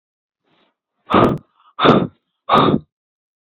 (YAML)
exhalation_length: 3.4 s
exhalation_amplitude: 27929
exhalation_signal_mean_std_ratio: 0.39
survey_phase: alpha (2021-03-01 to 2021-08-12)
age: 18-44
gender: Female
wearing_mask: 'No'
symptom_none: true
smoker_status: Never smoked
respiratory_condition_asthma: false
respiratory_condition_other: false
recruitment_source: REACT
submission_delay: 2 days
covid_test_result: Negative
covid_test_method: RT-qPCR